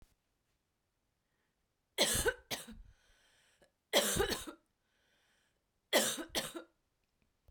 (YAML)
three_cough_length: 7.5 s
three_cough_amplitude: 5973
three_cough_signal_mean_std_ratio: 0.34
survey_phase: beta (2021-08-13 to 2022-03-07)
age: 45-64
gender: Female
wearing_mask: 'No'
symptom_none: true
smoker_status: Never smoked
respiratory_condition_asthma: false
respiratory_condition_other: false
recruitment_source: REACT
submission_delay: 1 day
covid_test_result: Negative
covid_test_method: RT-qPCR